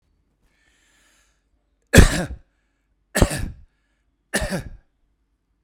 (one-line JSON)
{"three_cough_length": "5.6 s", "three_cough_amplitude": 32768, "three_cough_signal_mean_std_ratio": 0.24, "survey_phase": "beta (2021-08-13 to 2022-03-07)", "age": "45-64", "gender": "Male", "wearing_mask": "No", "symptom_none": true, "smoker_status": "Never smoked", "respiratory_condition_asthma": false, "respiratory_condition_other": false, "recruitment_source": "Test and Trace", "submission_delay": "4 days", "covid_test_result": "Negative", "covid_test_method": "RT-qPCR"}